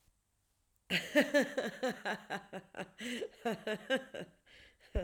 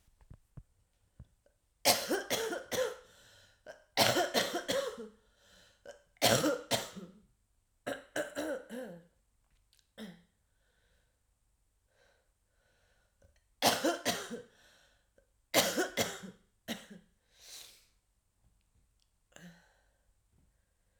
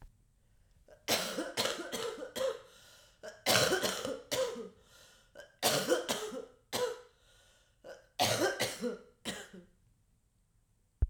exhalation_length: 5.0 s
exhalation_amplitude: 5540
exhalation_signal_mean_std_ratio: 0.46
three_cough_length: 21.0 s
three_cough_amplitude: 10656
three_cough_signal_mean_std_ratio: 0.35
cough_length: 11.1 s
cough_amplitude: 13076
cough_signal_mean_std_ratio: 0.5
survey_phase: alpha (2021-03-01 to 2021-08-12)
age: 45-64
gender: Female
wearing_mask: 'No'
symptom_cough_any: true
symptom_new_continuous_cough: true
symptom_shortness_of_breath: true
symptom_abdominal_pain: true
symptom_fatigue: true
symptom_headache: true
symptom_change_to_sense_of_smell_or_taste: true
symptom_loss_of_taste: true
symptom_onset: 2 days
smoker_status: Ex-smoker
respiratory_condition_asthma: false
respiratory_condition_other: false
recruitment_source: Test and Trace
submission_delay: 1 day
covid_test_result: Positive
covid_test_method: RT-qPCR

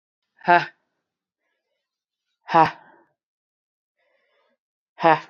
exhalation_length: 5.3 s
exhalation_amplitude: 29283
exhalation_signal_mean_std_ratio: 0.21
survey_phase: beta (2021-08-13 to 2022-03-07)
age: 18-44
gender: Female
wearing_mask: 'No'
symptom_cough_any: true
symptom_new_continuous_cough: true
symptom_runny_or_blocked_nose: true
symptom_shortness_of_breath: true
symptom_sore_throat: true
symptom_fatigue: true
symptom_fever_high_temperature: true
symptom_headache: true
symptom_change_to_sense_of_smell_or_taste: true
symptom_other: true
symptom_onset: 2 days
smoker_status: Never smoked
respiratory_condition_asthma: false
respiratory_condition_other: false
recruitment_source: Test and Trace
submission_delay: 2 days
covid_test_result: Positive
covid_test_method: RT-qPCR
covid_ct_value: 30.2
covid_ct_gene: ORF1ab gene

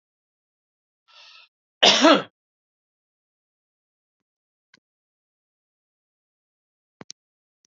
cough_length: 7.7 s
cough_amplitude: 29059
cough_signal_mean_std_ratio: 0.17
survey_phase: beta (2021-08-13 to 2022-03-07)
age: 45-64
gender: Male
wearing_mask: 'No'
symptom_cough_any: true
symptom_onset: 3 days
smoker_status: Ex-smoker
respiratory_condition_asthma: false
respiratory_condition_other: false
recruitment_source: Test and Trace
submission_delay: 2 days
covid_test_result: Negative
covid_test_method: RT-qPCR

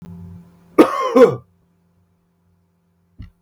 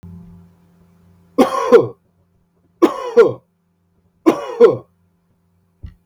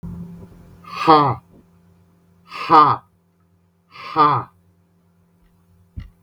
cough_length: 3.4 s
cough_amplitude: 32768
cough_signal_mean_std_ratio: 0.29
three_cough_length: 6.1 s
three_cough_amplitude: 32768
three_cough_signal_mean_std_ratio: 0.33
exhalation_length: 6.2 s
exhalation_amplitude: 32766
exhalation_signal_mean_std_ratio: 0.33
survey_phase: beta (2021-08-13 to 2022-03-07)
age: 45-64
gender: Male
wearing_mask: 'No'
symptom_none: true
smoker_status: Never smoked
respiratory_condition_asthma: false
respiratory_condition_other: false
recruitment_source: REACT
submission_delay: 6 days
covid_test_result: Negative
covid_test_method: RT-qPCR
influenza_a_test_result: Unknown/Void
influenza_b_test_result: Unknown/Void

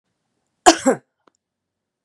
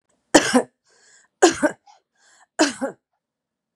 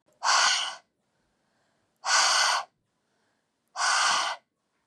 cough_length: 2.0 s
cough_amplitude: 32768
cough_signal_mean_std_ratio: 0.22
three_cough_length: 3.8 s
three_cough_amplitude: 32767
three_cough_signal_mean_std_ratio: 0.3
exhalation_length: 4.9 s
exhalation_amplitude: 9934
exhalation_signal_mean_std_ratio: 0.5
survey_phase: beta (2021-08-13 to 2022-03-07)
age: 45-64
gender: Female
wearing_mask: 'No'
symptom_none: true
smoker_status: Current smoker (1 to 10 cigarettes per day)
respiratory_condition_asthma: false
respiratory_condition_other: false
recruitment_source: REACT
submission_delay: 1 day
covid_test_result: Negative
covid_test_method: RT-qPCR
covid_ct_value: 38.2
covid_ct_gene: N gene
influenza_a_test_result: Negative
influenza_b_test_result: Negative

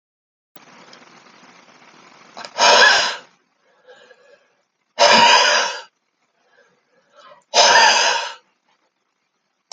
exhalation_length: 9.7 s
exhalation_amplitude: 32768
exhalation_signal_mean_std_ratio: 0.38
survey_phase: alpha (2021-03-01 to 2021-08-12)
age: 65+
gender: Male
wearing_mask: 'No'
symptom_fatigue: true
symptom_headache: true
smoker_status: Never smoked
respiratory_condition_asthma: false
respiratory_condition_other: false
recruitment_source: Test and Trace
submission_delay: 3 days
covid_test_result: Positive
covid_test_method: RT-qPCR
covid_ct_value: 13.8
covid_ct_gene: ORF1ab gene
covid_ct_mean: 14.8
covid_viral_load: 14000000 copies/ml
covid_viral_load_category: High viral load (>1M copies/ml)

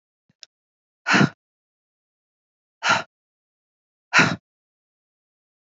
exhalation_length: 5.6 s
exhalation_amplitude: 26132
exhalation_signal_mean_std_ratio: 0.24
survey_phase: beta (2021-08-13 to 2022-03-07)
age: 45-64
gender: Female
wearing_mask: 'No'
symptom_cough_any: true
symptom_runny_or_blocked_nose: true
symptom_headache: true
symptom_change_to_sense_of_smell_or_taste: true
symptom_other: true
symptom_onset: 4 days
smoker_status: Current smoker (1 to 10 cigarettes per day)
respiratory_condition_asthma: false
respiratory_condition_other: false
recruitment_source: Test and Trace
submission_delay: 2 days
covid_test_result: Positive
covid_test_method: RT-qPCR
covid_ct_value: 23.9
covid_ct_gene: N gene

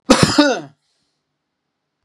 cough_length: 2.0 s
cough_amplitude: 32768
cough_signal_mean_std_ratio: 0.36
survey_phase: beta (2021-08-13 to 2022-03-07)
age: 45-64
gender: Male
wearing_mask: 'No'
symptom_none: true
smoker_status: Never smoked
respiratory_condition_asthma: false
respiratory_condition_other: false
recruitment_source: REACT
submission_delay: 3 days
covid_test_result: Negative
covid_test_method: RT-qPCR
influenza_a_test_result: Negative
influenza_b_test_result: Negative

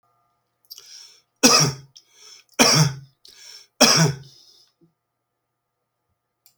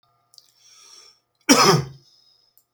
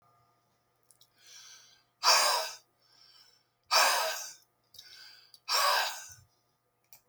three_cough_length: 6.6 s
three_cough_amplitude: 32768
three_cough_signal_mean_std_ratio: 0.32
cough_length: 2.7 s
cough_amplitude: 32644
cough_signal_mean_std_ratio: 0.3
exhalation_length: 7.1 s
exhalation_amplitude: 9509
exhalation_signal_mean_std_ratio: 0.38
survey_phase: beta (2021-08-13 to 2022-03-07)
age: 45-64
gender: Male
wearing_mask: 'No'
symptom_none: true
smoker_status: Never smoked
respiratory_condition_asthma: true
respiratory_condition_other: false
recruitment_source: REACT
submission_delay: 1 day
covid_test_result: Negative
covid_test_method: RT-qPCR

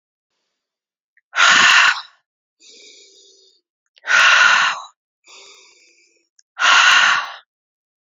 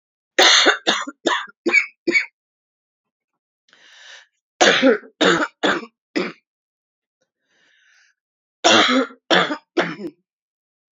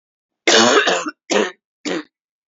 exhalation_length: 8.0 s
exhalation_amplitude: 32021
exhalation_signal_mean_std_ratio: 0.42
three_cough_length: 10.9 s
three_cough_amplitude: 30542
three_cough_signal_mean_std_ratio: 0.4
cough_length: 2.5 s
cough_amplitude: 31601
cough_signal_mean_std_ratio: 0.49
survey_phase: beta (2021-08-13 to 2022-03-07)
age: 45-64
gender: Female
wearing_mask: 'No'
symptom_cough_any: true
symptom_shortness_of_breath: true
symptom_sore_throat: true
symptom_abdominal_pain: true
symptom_diarrhoea: true
symptom_fever_high_temperature: true
symptom_headache: true
symptom_onset: 11 days
smoker_status: Never smoked
respiratory_condition_asthma: false
respiratory_condition_other: false
recruitment_source: REACT
submission_delay: 3 days
covid_test_result: Negative
covid_test_method: RT-qPCR
influenza_a_test_result: Unknown/Void
influenza_b_test_result: Unknown/Void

